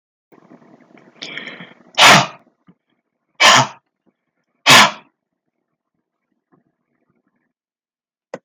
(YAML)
exhalation_length: 8.4 s
exhalation_amplitude: 32768
exhalation_signal_mean_std_ratio: 0.26
survey_phase: beta (2021-08-13 to 2022-03-07)
age: 65+
gender: Male
wearing_mask: 'No'
symptom_none: true
smoker_status: Never smoked
respiratory_condition_asthma: false
respiratory_condition_other: false
recruitment_source: REACT
submission_delay: 11 days
covid_test_result: Negative
covid_test_method: RT-qPCR